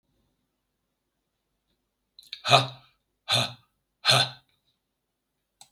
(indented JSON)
{
  "exhalation_length": "5.7 s",
  "exhalation_amplitude": 26876,
  "exhalation_signal_mean_std_ratio": 0.25,
  "survey_phase": "beta (2021-08-13 to 2022-03-07)",
  "age": "65+",
  "gender": "Male",
  "wearing_mask": "No",
  "symptom_none": true,
  "smoker_status": "Ex-smoker",
  "respiratory_condition_asthma": false,
  "respiratory_condition_other": false,
  "recruitment_source": "REACT",
  "submission_delay": "1 day",
  "covid_test_result": "Negative",
  "covid_test_method": "RT-qPCR",
  "influenza_a_test_result": "Negative",
  "influenza_b_test_result": "Negative"
}